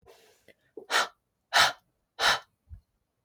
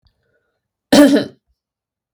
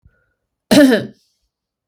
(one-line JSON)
{"exhalation_length": "3.2 s", "exhalation_amplitude": 14393, "exhalation_signal_mean_std_ratio": 0.32, "three_cough_length": "2.1 s", "three_cough_amplitude": 32768, "three_cough_signal_mean_std_ratio": 0.31, "cough_length": "1.9 s", "cough_amplitude": 32768, "cough_signal_mean_std_ratio": 0.33, "survey_phase": "beta (2021-08-13 to 2022-03-07)", "age": "18-44", "gender": "Female", "wearing_mask": "Yes", "symptom_none": true, "smoker_status": "Never smoked", "respiratory_condition_asthma": false, "respiratory_condition_other": false, "recruitment_source": "Test and Trace", "submission_delay": "13 days", "covid_test_result": "Negative", "covid_test_method": "RT-qPCR"}